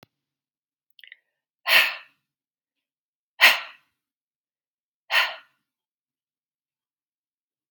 {"exhalation_length": "7.7 s", "exhalation_amplitude": 29365, "exhalation_signal_mean_std_ratio": 0.21, "survey_phase": "beta (2021-08-13 to 2022-03-07)", "age": "45-64", "gender": "Female", "wearing_mask": "No", "symptom_none": true, "smoker_status": "Ex-smoker", "respiratory_condition_asthma": false, "respiratory_condition_other": false, "recruitment_source": "REACT", "submission_delay": "0 days", "covid_test_result": "Negative", "covid_test_method": "RT-qPCR"}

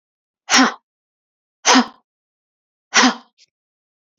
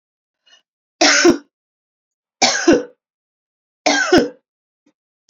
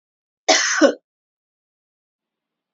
{"exhalation_length": "4.2 s", "exhalation_amplitude": 32768, "exhalation_signal_mean_std_ratio": 0.3, "three_cough_length": "5.3 s", "three_cough_amplitude": 32409, "three_cough_signal_mean_std_ratio": 0.37, "cough_length": "2.7 s", "cough_amplitude": 30279, "cough_signal_mean_std_ratio": 0.3, "survey_phase": "beta (2021-08-13 to 2022-03-07)", "age": "18-44", "gender": "Female", "wearing_mask": "Yes", "symptom_runny_or_blocked_nose": true, "symptom_sore_throat": true, "symptom_onset": "6 days", "smoker_status": "Never smoked", "recruitment_source": "REACT", "submission_delay": "1 day", "covid_test_result": "Negative", "covid_test_method": "RT-qPCR", "influenza_a_test_result": "Negative", "influenza_b_test_result": "Negative"}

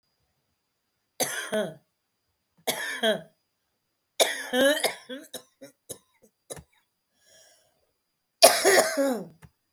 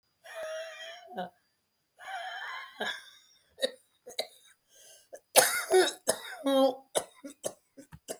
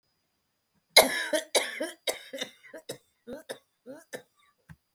{"three_cough_length": "9.7 s", "three_cough_amplitude": 29944, "three_cough_signal_mean_std_ratio": 0.34, "exhalation_length": "8.2 s", "exhalation_amplitude": 19183, "exhalation_signal_mean_std_ratio": 0.38, "cough_length": "4.9 s", "cough_amplitude": 27736, "cough_signal_mean_std_ratio": 0.28, "survey_phase": "beta (2021-08-13 to 2022-03-07)", "age": "45-64", "gender": "Female", "wearing_mask": "No", "symptom_new_continuous_cough": true, "symptom_runny_or_blocked_nose": true, "symptom_shortness_of_breath": true, "symptom_sore_throat": true, "symptom_fatigue": true, "symptom_headache": true, "symptom_change_to_sense_of_smell_or_taste": true, "symptom_onset": "9 days", "smoker_status": "Ex-smoker", "respiratory_condition_asthma": false, "respiratory_condition_other": false, "recruitment_source": "Test and Trace", "submission_delay": "6 days", "covid_test_result": "Negative", "covid_test_method": "RT-qPCR"}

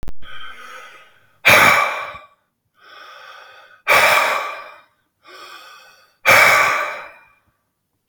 {"exhalation_length": "8.1 s", "exhalation_amplitude": 32768, "exhalation_signal_mean_std_ratio": 0.45, "survey_phase": "beta (2021-08-13 to 2022-03-07)", "age": "65+", "gender": "Male", "wearing_mask": "No", "symptom_cough_any": true, "symptom_runny_or_blocked_nose": true, "symptom_other": true, "symptom_onset": "3 days", "smoker_status": "Ex-smoker", "respiratory_condition_asthma": false, "respiratory_condition_other": false, "recruitment_source": "Test and Trace", "submission_delay": "2 days", "covid_test_result": "Positive", "covid_test_method": "RT-qPCR", "covid_ct_value": 16.9, "covid_ct_gene": "ORF1ab gene"}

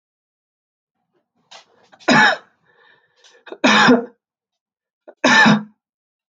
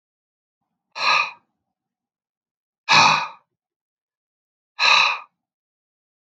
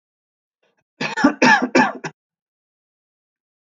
{"three_cough_length": "6.3 s", "three_cough_amplitude": 28586, "three_cough_signal_mean_std_ratio": 0.34, "exhalation_length": "6.2 s", "exhalation_amplitude": 26719, "exhalation_signal_mean_std_ratio": 0.32, "cough_length": "3.7 s", "cough_amplitude": 27973, "cough_signal_mean_std_ratio": 0.33, "survey_phase": "alpha (2021-03-01 to 2021-08-12)", "age": "45-64", "gender": "Male", "wearing_mask": "No", "symptom_none": true, "smoker_status": "Ex-smoker", "respiratory_condition_asthma": false, "respiratory_condition_other": false, "recruitment_source": "REACT", "submission_delay": "8 days", "covid_test_result": "Negative", "covid_test_method": "RT-qPCR"}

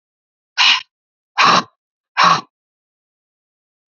{"exhalation_length": "3.9 s", "exhalation_amplitude": 32767, "exhalation_signal_mean_std_ratio": 0.34, "survey_phase": "beta (2021-08-13 to 2022-03-07)", "age": "45-64", "gender": "Female", "wearing_mask": "No", "symptom_none": true, "smoker_status": "Never smoked", "respiratory_condition_asthma": false, "respiratory_condition_other": false, "recruitment_source": "REACT", "submission_delay": "2 days", "covid_test_result": "Negative", "covid_test_method": "RT-qPCR", "influenza_a_test_result": "Negative", "influenza_b_test_result": "Negative"}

